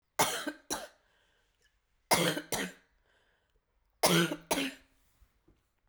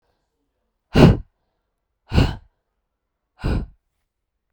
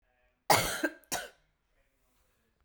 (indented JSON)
{
  "three_cough_length": "5.9 s",
  "three_cough_amplitude": 8946,
  "three_cough_signal_mean_std_ratio": 0.36,
  "exhalation_length": "4.5 s",
  "exhalation_amplitude": 32768,
  "exhalation_signal_mean_std_ratio": 0.26,
  "cough_length": "2.6 s",
  "cough_amplitude": 13400,
  "cough_signal_mean_std_ratio": 0.3,
  "survey_phase": "beta (2021-08-13 to 2022-03-07)",
  "age": "18-44",
  "gender": "Female",
  "wearing_mask": "No",
  "symptom_cough_any": true,
  "symptom_new_continuous_cough": true,
  "symptom_runny_or_blocked_nose": true,
  "symptom_fever_high_temperature": true,
  "symptom_headache": true,
  "symptom_other": true,
  "symptom_onset": "3 days",
  "smoker_status": "Ex-smoker",
  "respiratory_condition_asthma": false,
  "respiratory_condition_other": false,
  "recruitment_source": "Test and Trace",
  "submission_delay": "1 day",
  "covid_test_result": "Positive",
  "covid_test_method": "RT-qPCR",
  "covid_ct_value": 29.0,
  "covid_ct_gene": "ORF1ab gene",
  "covid_ct_mean": 29.8,
  "covid_viral_load": "170 copies/ml",
  "covid_viral_load_category": "Minimal viral load (< 10K copies/ml)"
}